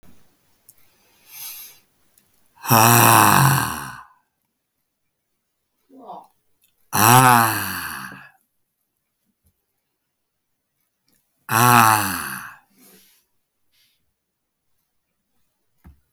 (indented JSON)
{
  "exhalation_length": "16.1 s",
  "exhalation_amplitude": 32766,
  "exhalation_signal_mean_std_ratio": 0.31,
  "survey_phase": "beta (2021-08-13 to 2022-03-07)",
  "age": "65+",
  "gender": "Male",
  "wearing_mask": "No",
  "symptom_none": true,
  "smoker_status": "Never smoked",
  "respiratory_condition_asthma": false,
  "respiratory_condition_other": false,
  "recruitment_source": "REACT",
  "submission_delay": "2 days",
  "covid_test_result": "Negative",
  "covid_test_method": "RT-qPCR",
  "influenza_a_test_result": "Negative",
  "influenza_b_test_result": "Negative"
}